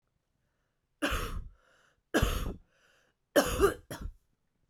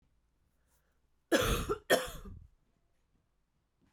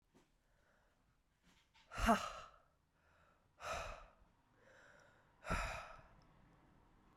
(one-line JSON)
{"three_cough_length": "4.7 s", "three_cough_amplitude": 9808, "three_cough_signal_mean_std_ratio": 0.38, "cough_length": "3.9 s", "cough_amplitude": 7875, "cough_signal_mean_std_ratio": 0.32, "exhalation_length": "7.2 s", "exhalation_amplitude": 3458, "exhalation_signal_mean_std_ratio": 0.3, "survey_phase": "alpha (2021-03-01 to 2021-08-12)", "age": "18-44", "gender": "Female", "wearing_mask": "No", "symptom_cough_any": true, "symptom_fatigue": true, "symptom_headache": true, "smoker_status": "Ex-smoker", "respiratory_condition_asthma": false, "respiratory_condition_other": false, "recruitment_source": "Test and Trace", "submission_delay": "2 days", "covid_test_result": "Positive", "covid_test_method": "RT-qPCR", "covid_ct_value": 20.0, "covid_ct_gene": "N gene", "covid_ct_mean": 20.3, "covid_viral_load": "210000 copies/ml", "covid_viral_load_category": "Low viral load (10K-1M copies/ml)"}